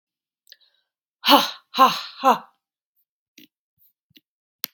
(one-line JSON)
{"exhalation_length": "4.7 s", "exhalation_amplitude": 31605, "exhalation_signal_mean_std_ratio": 0.26, "survey_phase": "beta (2021-08-13 to 2022-03-07)", "age": "45-64", "gender": "Female", "wearing_mask": "No", "symptom_none": true, "smoker_status": "Never smoked", "respiratory_condition_asthma": false, "respiratory_condition_other": false, "recruitment_source": "REACT", "submission_delay": "1 day", "covid_test_result": "Negative", "covid_test_method": "RT-qPCR"}